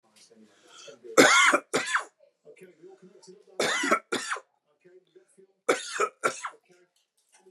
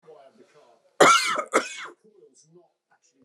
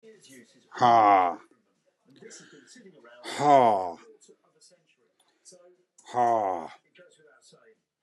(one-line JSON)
{"three_cough_length": "7.5 s", "three_cough_amplitude": 22933, "three_cough_signal_mean_std_ratio": 0.36, "cough_length": "3.2 s", "cough_amplitude": 26076, "cough_signal_mean_std_ratio": 0.32, "exhalation_length": "8.0 s", "exhalation_amplitude": 17537, "exhalation_signal_mean_std_ratio": 0.35, "survey_phase": "beta (2021-08-13 to 2022-03-07)", "age": "45-64", "gender": "Male", "wearing_mask": "No", "symptom_none": true, "smoker_status": "Never smoked", "respiratory_condition_asthma": false, "respiratory_condition_other": false, "recruitment_source": "REACT", "submission_delay": "1 day", "covid_test_result": "Negative", "covid_test_method": "RT-qPCR", "influenza_a_test_result": "Negative", "influenza_b_test_result": "Negative"}